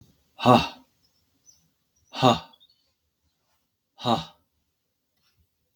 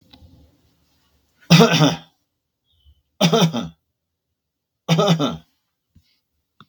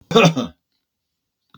{"exhalation_length": "5.8 s", "exhalation_amplitude": 27855, "exhalation_signal_mean_std_ratio": 0.23, "three_cough_length": "6.7 s", "three_cough_amplitude": 32768, "three_cough_signal_mean_std_ratio": 0.34, "cough_length": "1.6 s", "cough_amplitude": 32767, "cough_signal_mean_std_ratio": 0.34, "survey_phase": "beta (2021-08-13 to 2022-03-07)", "age": "65+", "gender": "Male", "wearing_mask": "No", "symptom_none": true, "symptom_onset": "12 days", "smoker_status": "Never smoked", "respiratory_condition_asthma": false, "respiratory_condition_other": false, "recruitment_source": "REACT", "submission_delay": "0 days", "covid_test_result": "Negative", "covid_test_method": "RT-qPCR", "covid_ct_value": 37.0, "covid_ct_gene": "N gene", "influenza_a_test_result": "Negative", "influenza_b_test_result": "Negative"}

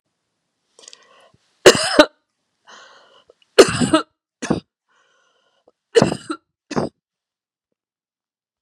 {"three_cough_length": "8.6 s", "three_cough_amplitude": 32768, "three_cough_signal_mean_std_ratio": 0.24, "survey_phase": "beta (2021-08-13 to 2022-03-07)", "age": "65+", "gender": "Female", "wearing_mask": "No", "symptom_none": true, "smoker_status": "Ex-smoker", "respiratory_condition_asthma": false, "respiratory_condition_other": false, "recruitment_source": "REACT", "submission_delay": "3 days", "covid_test_result": "Negative", "covid_test_method": "RT-qPCR", "influenza_a_test_result": "Negative", "influenza_b_test_result": "Negative"}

